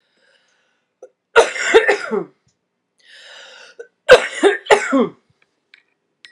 {
  "cough_length": "6.3 s",
  "cough_amplitude": 32768,
  "cough_signal_mean_std_ratio": 0.34,
  "survey_phase": "alpha (2021-03-01 to 2021-08-12)",
  "age": "45-64",
  "gender": "Female",
  "wearing_mask": "No",
  "symptom_fatigue": true,
  "symptom_headache": true,
  "symptom_change_to_sense_of_smell_or_taste": true,
  "symptom_onset": "5 days",
  "smoker_status": "Ex-smoker",
  "respiratory_condition_asthma": true,
  "respiratory_condition_other": false,
  "recruitment_source": "Test and Trace",
  "submission_delay": "2 days",
  "covid_test_result": "Positive",
  "covid_test_method": "RT-qPCR",
  "covid_ct_value": 12.3,
  "covid_ct_gene": "ORF1ab gene",
  "covid_ct_mean": 12.9,
  "covid_viral_load": "61000000 copies/ml",
  "covid_viral_load_category": "High viral load (>1M copies/ml)"
}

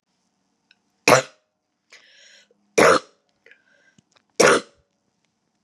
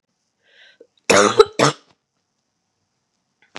{
  "three_cough_length": "5.6 s",
  "three_cough_amplitude": 31393,
  "three_cough_signal_mean_std_ratio": 0.25,
  "cough_length": "3.6 s",
  "cough_amplitude": 32768,
  "cough_signal_mean_std_ratio": 0.26,
  "survey_phase": "beta (2021-08-13 to 2022-03-07)",
  "age": "18-44",
  "gender": "Female",
  "wearing_mask": "No",
  "symptom_cough_any": true,
  "symptom_new_continuous_cough": true,
  "symptom_runny_or_blocked_nose": true,
  "symptom_abdominal_pain": true,
  "symptom_diarrhoea": true,
  "symptom_fatigue": true,
  "symptom_other": true,
  "symptom_onset": "3 days",
  "smoker_status": "Never smoked",
  "respiratory_condition_asthma": false,
  "respiratory_condition_other": false,
  "recruitment_source": "Test and Trace",
  "submission_delay": "1 day",
  "covid_test_result": "Positive",
  "covid_test_method": "RT-qPCR",
  "covid_ct_value": 17.6,
  "covid_ct_gene": "ORF1ab gene",
  "covid_ct_mean": 18.8,
  "covid_viral_load": "680000 copies/ml",
  "covid_viral_load_category": "Low viral load (10K-1M copies/ml)"
}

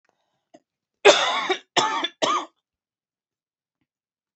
{
  "three_cough_length": "4.4 s",
  "three_cough_amplitude": 29408,
  "three_cough_signal_mean_std_ratio": 0.33,
  "survey_phase": "beta (2021-08-13 to 2022-03-07)",
  "age": "45-64",
  "gender": "Female",
  "wearing_mask": "No",
  "symptom_cough_any": true,
  "symptom_new_continuous_cough": true,
  "symptom_runny_or_blocked_nose": true,
  "symptom_shortness_of_breath": true,
  "symptom_sore_throat": true,
  "symptom_fatigue": true,
  "symptom_headache": true,
  "symptom_onset": "2 days",
  "smoker_status": "Ex-smoker",
  "respiratory_condition_asthma": false,
  "respiratory_condition_other": false,
  "recruitment_source": "Test and Trace",
  "submission_delay": "1 day",
  "covid_test_result": "Positive",
  "covid_test_method": "RT-qPCR",
  "covid_ct_value": 21.5,
  "covid_ct_gene": "ORF1ab gene",
  "covid_ct_mean": 22.2,
  "covid_viral_load": "53000 copies/ml",
  "covid_viral_load_category": "Low viral load (10K-1M copies/ml)"
}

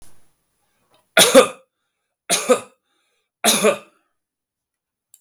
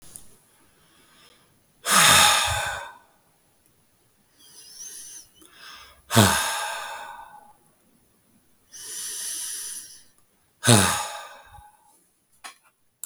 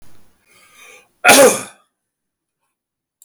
{
  "three_cough_length": "5.2 s",
  "three_cough_amplitude": 32766,
  "three_cough_signal_mean_std_ratio": 0.3,
  "exhalation_length": "13.1 s",
  "exhalation_amplitude": 32766,
  "exhalation_signal_mean_std_ratio": 0.35,
  "cough_length": "3.2 s",
  "cough_amplitude": 32768,
  "cough_signal_mean_std_ratio": 0.29,
  "survey_phase": "beta (2021-08-13 to 2022-03-07)",
  "age": "45-64",
  "gender": "Male",
  "wearing_mask": "No",
  "symptom_none": true,
  "symptom_onset": "7 days",
  "smoker_status": "Ex-smoker",
  "respiratory_condition_asthma": false,
  "respiratory_condition_other": false,
  "recruitment_source": "REACT",
  "submission_delay": "2 days",
  "covid_test_result": "Negative",
  "covid_test_method": "RT-qPCR",
  "influenza_a_test_result": "Negative",
  "influenza_b_test_result": "Negative"
}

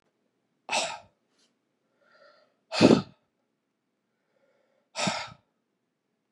{
  "exhalation_length": "6.3 s",
  "exhalation_amplitude": 19894,
  "exhalation_signal_mean_std_ratio": 0.22,
  "survey_phase": "beta (2021-08-13 to 2022-03-07)",
  "age": "45-64",
  "gender": "Male",
  "wearing_mask": "No",
  "symptom_cough_any": true,
  "symptom_runny_or_blocked_nose": true,
  "symptom_sore_throat": true,
  "symptom_fatigue": true,
  "symptom_other": true,
  "symptom_onset": "4 days",
  "smoker_status": "Never smoked",
  "respiratory_condition_asthma": false,
  "respiratory_condition_other": false,
  "recruitment_source": "Test and Trace",
  "submission_delay": "2 days",
  "covid_test_result": "Positive",
  "covid_test_method": "RT-qPCR",
  "covid_ct_value": 18.1,
  "covid_ct_gene": "ORF1ab gene",
  "covid_ct_mean": 18.2,
  "covid_viral_load": "1000000 copies/ml",
  "covid_viral_load_category": "High viral load (>1M copies/ml)"
}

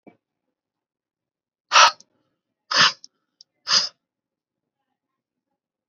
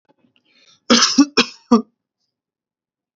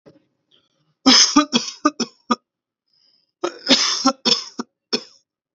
{
  "exhalation_length": "5.9 s",
  "exhalation_amplitude": 29210,
  "exhalation_signal_mean_std_ratio": 0.23,
  "cough_length": "3.2 s",
  "cough_amplitude": 29443,
  "cough_signal_mean_std_ratio": 0.31,
  "three_cough_length": "5.5 s",
  "three_cough_amplitude": 31422,
  "three_cough_signal_mean_std_ratio": 0.37,
  "survey_phase": "beta (2021-08-13 to 2022-03-07)",
  "age": "18-44",
  "gender": "Male",
  "wearing_mask": "No",
  "symptom_none": true,
  "smoker_status": "Never smoked",
  "respiratory_condition_asthma": false,
  "respiratory_condition_other": false,
  "recruitment_source": "REACT",
  "submission_delay": "3 days",
  "covid_test_result": "Negative",
  "covid_test_method": "RT-qPCR"
}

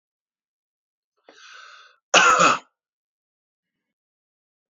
{
  "cough_length": "4.7 s",
  "cough_amplitude": 29584,
  "cough_signal_mean_std_ratio": 0.25,
  "survey_phase": "beta (2021-08-13 to 2022-03-07)",
  "age": "65+",
  "gender": "Male",
  "wearing_mask": "No",
  "symptom_none": true,
  "symptom_onset": "4 days",
  "smoker_status": "Ex-smoker",
  "respiratory_condition_asthma": false,
  "respiratory_condition_other": false,
  "recruitment_source": "REACT",
  "submission_delay": "1 day",
  "covid_test_result": "Negative",
  "covid_test_method": "RT-qPCR"
}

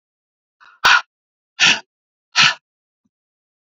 {
  "exhalation_length": "3.8 s",
  "exhalation_amplitude": 32618,
  "exhalation_signal_mean_std_ratio": 0.29,
  "survey_phase": "beta (2021-08-13 to 2022-03-07)",
  "age": "45-64",
  "gender": "Male",
  "wearing_mask": "No",
  "symptom_cough_any": true,
  "symptom_runny_or_blocked_nose": true,
  "symptom_sore_throat": true,
  "symptom_headache": true,
  "symptom_onset": "3 days",
  "smoker_status": "Never smoked",
  "respiratory_condition_asthma": false,
  "respiratory_condition_other": false,
  "recruitment_source": "Test and Trace",
  "submission_delay": "2 days",
  "covid_test_result": "Positive",
  "covid_test_method": "RT-qPCR",
  "covid_ct_value": 24.5,
  "covid_ct_gene": "N gene",
  "covid_ct_mean": 24.6,
  "covid_viral_load": "8500 copies/ml",
  "covid_viral_load_category": "Minimal viral load (< 10K copies/ml)"
}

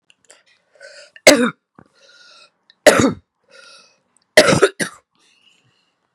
{
  "three_cough_length": "6.1 s",
  "three_cough_amplitude": 32768,
  "three_cough_signal_mean_std_ratio": 0.28,
  "survey_phase": "beta (2021-08-13 to 2022-03-07)",
  "age": "45-64",
  "gender": "Female",
  "wearing_mask": "No",
  "symptom_runny_or_blocked_nose": true,
  "symptom_sore_throat": true,
  "symptom_fatigue": true,
  "symptom_onset": "13 days",
  "smoker_status": "Never smoked",
  "respiratory_condition_asthma": false,
  "respiratory_condition_other": false,
  "recruitment_source": "REACT",
  "submission_delay": "2 days",
  "covid_test_result": "Negative",
  "covid_test_method": "RT-qPCR"
}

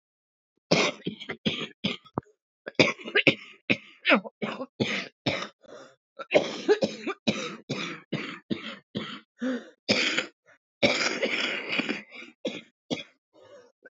{
  "cough_length": "13.9 s",
  "cough_amplitude": 22971,
  "cough_signal_mean_std_ratio": 0.45,
  "survey_phase": "beta (2021-08-13 to 2022-03-07)",
  "age": "18-44",
  "gender": "Female",
  "wearing_mask": "No",
  "symptom_new_continuous_cough": true,
  "symptom_runny_or_blocked_nose": true,
  "symptom_shortness_of_breath": true,
  "symptom_sore_throat": true,
  "symptom_fatigue": true,
  "symptom_onset": "8 days",
  "smoker_status": "Current smoker (1 to 10 cigarettes per day)",
  "respiratory_condition_asthma": true,
  "respiratory_condition_other": false,
  "recruitment_source": "REACT",
  "submission_delay": "2 days",
  "covid_test_result": "Negative",
  "covid_test_method": "RT-qPCR",
  "influenza_a_test_result": "Negative",
  "influenza_b_test_result": "Negative"
}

